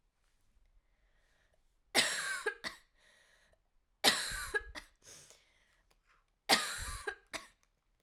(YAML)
three_cough_length: 8.0 s
three_cough_amplitude: 8193
three_cough_signal_mean_std_ratio: 0.33
survey_phase: alpha (2021-03-01 to 2021-08-12)
age: 18-44
gender: Female
wearing_mask: 'No'
symptom_cough_any: true
symptom_new_continuous_cough: true
symptom_shortness_of_breath: true
symptom_fatigue: true
symptom_fever_high_temperature: true
symptom_change_to_sense_of_smell_or_taste: true
symptom_onset: 4 days
smoker_status: Never smoked
respiratory_condition_asthma: false
respiratory_condition_other: false
recruitment_source: Test and Trace
submission_delay: 2 days
covid_test_result: Positive
covid_test_method: RT-qPCR